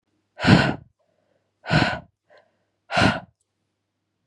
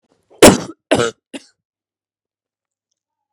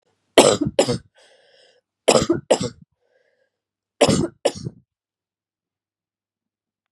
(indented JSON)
{
  "exhalation_length": "4.3 s",
  "exhalation_amplitude": 26905,
  "exhalation_signal_mean_std_ratio": 0.34,
  "cough_length": "3.3 s",
  "cough_amplitude": 32768,
  "cough_signal_mean_std_ratio": 0.23,
  "three_cough_length": "6.9 s",
  "three_cough_amplitude": 32768,
  "three_cough_signal_mean_std_ratio": 0.3,
  "survey_phase": "beta (2021-08-13 to 2022-03-07)",
  "age": "18-44",
  "gender": "Female",
  "wearing_mask": "No",
  "symptom_cough_any": true,
  "symptom_new_continuous_cough": true,
  "symptom_runny_or_blocked_nose": true,
  "symptom_sore_throat": true,
  "symptom_fatigue": true,
  "symptom_headache": true,
  "symptom_onset": "4 days",
  "smoker_status": "Current smoker (1 to 10 cigarettes per day)",
  "respiratory_condition_asthma": false,
  "respiratory_condition_other": false,
  "recruitment_source": "Test and Trace",
  "submission_delay": "1 day",
  "covid_test_result": "Positive",
  "covid_test_method": "RT-qPCR",
  "covid_ct_value": 22.6,
  "covid_ct_gene": "N gene"
}